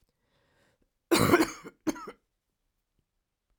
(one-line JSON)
{"three_cough_length": "3.6 s", "three_cough_amplitude": 14746, "three_cough_signal_mean_std_ratio": 0.28, "survey_phase": "alpha (2021-03-01 to 2021-08-12)", "age": "45-64", "gender": "Female", "wearing_mask": "No", "symptom_new_continuous_cough": true, "symptom_shortness_of_breath": true, "symptom_abdominal_pain": true, "symptom_diarrhoea": true, "symptom_fatigue": true, "symptom_fever_high_temperature": true, "symptom_headache": true, "smoker_status": "Never smoked", "respiratory_condition_asthma": false, "respiratory_condition_other": false, "recruitment_source": "Test and Trace", "submission_delay": "2 days", "covid_test_result": "Positive", "covid_test_method": "RT-qPCR", "covid_ct_value": 17.6, "covid_ct_gene": "ORF1ab gene", "covid_ct_mean": 18.1, "covid_viral_load": "1100000 copies/ml", "covid_viral_load_category": "High viral load (>1M copies/ml)"}